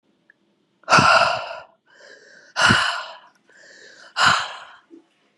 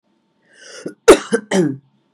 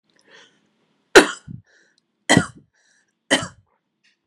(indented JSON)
{
  "exhalation_length": "5.4 s",
  "exhalation_amplitude": 30021,
  "exhalation_signal_mean_std_ratio": 0.41,
  "cough_length": "2.1 s",
  "cough_amplitude": 32768,
  "cough_signal_mean_std_ratio": 0.32,
  "three_cough_length": "4.3 s",
  "three_cough_amplitude": 32768,
  "three_cough_signal_mean_std_ratio": 0.21,
  "survey_phase": "beta (2021-08-13 to 2022-03-07)",
  "age": "18-44",
  "gender": "Female",
  "wearing_mask": "No",
  "symptom_cough_any": true,
  "symptom_runny_or_blocked_nose": true,
  "symptom_sore_throat": true,
  "symptom_fatigue": true,
  "symptom_headache": true,
  "smoker_status": "Ex-smoker",
  "respiratory_condition_asthma": false,
  "respiratory_condition_other": false,
  "recruitment_source": "Test and Trace",
  "submission_delay": "2 days",
  "covid_test_result": "Positive",
  "covid_test_method": "ePCR"
}